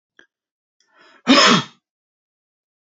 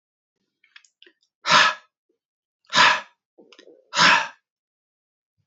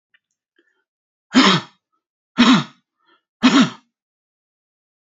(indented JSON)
{
  "cough_length": "2.8 s",
  "cough_amplitude": 29321,
  "cough_signal_mean_std_ratio": 0.29,
  "exhalation_length": "5.5 s",
  "exhalation_amplitude": 25620,
  "exhalation_signal_mean_std_ratio": 0.31,
  "three_cough_length": "5.0 s",
  "three_cough_amplitude": 31531,
  "three_cough_signal_mean_std_ratio": 0.32,
  "survey_phase": "alpha (2021-03-01 to 2021-08-12)",
  "age": "18-44",
  "gender": "Male",
  "wearing_mask": "No",
  "symptom_none": true,
  "smoker_status": "Never smoked",
  "respiratory_condition_asthma": false,
  "respiratory_condition_other": false,
  "recruitment_source": "REACT",
  "submission_delay": "2 days",
  "covid_test_result": "Negative",
  "covid_test_method": "RT-qPCR"
}